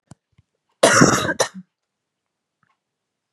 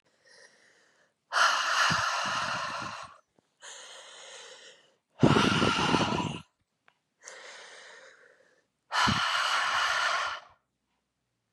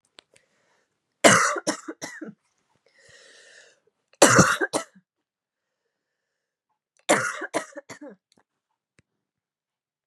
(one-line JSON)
{"cough_length": "3.3 s", "cough_amplitude": 32767, "cough_signal_mean_std_ratio": 0.31, "exhalation_length": "11.5 s", "exhalation_amplitude": 13234, "exhalation_signal_mean_std_ratio": 0.52, "three_cough_length": "10.1 s", "three_cough_amplitude": 32767, "three_cough_signal_mean_std_ratio": 0.26, "survey_phase": "beta (2021-08-13 to 2022-03-07)", "age": "18-44", "gender": "Female", "wearing_mask": "No", "symptom_cough_any": true, "symptom_runny_or_blocked_nose": true, "symptom_sore_throat": true, "symptom_change_to_sense_of_smell_or_taste": true, "symptom_onset": "11 days", "smoker_status": "Never smoked", "respiratory_condition_asthma": false, "respiratory_condition_other": false, "recruitment_source": "Test and Trace", "submission_delay": "1 day", "covid_test_result": "Positive", "covid_test_method": "RT-qPCR", "covid_ct_value": 23.0, "covid_ct_gene": "ORF1ab gene", "covid_ct_mean": 23.4, "covid_viral_load": "22000 copies/ml", "covid_viral_load_category": "Low viral load (10K-1M copies/ml)"}